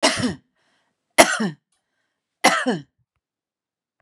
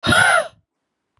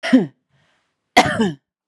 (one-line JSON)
{"three_cough_length": "4.0 s", "three_cough_amplitude": 32768, "three_cough_signal_mean_std_ratio": 0.32, "exhalation_length": "1.2 s", "exhalation_amplitude": 27715, "exhalation_signal_mean_std_ratio": 0.51, "cough_length": "1.9 s", "cough_amplitude": 32768, "cough_signal_mean_std_ratio": 0.39, "survey_phase": "beta (2021-08-13 to 2022-03-07)", "age": "45-64", "gender": "Female", "wearing_mask": "No", "symptom_none": true, "smoker_status": "Prefer not to say", "respiratory_condition_asthma": false, "respiratory_condition_other": false, "recruitment_source": "REACT", "submission_delay": "2 days", "covid_test_result": "Negative", "covid_test_method": "RT-qPCR", "influenza_a_test_result": "Unknown/Void", "influenza_b_test_result": "Unknown/Void"}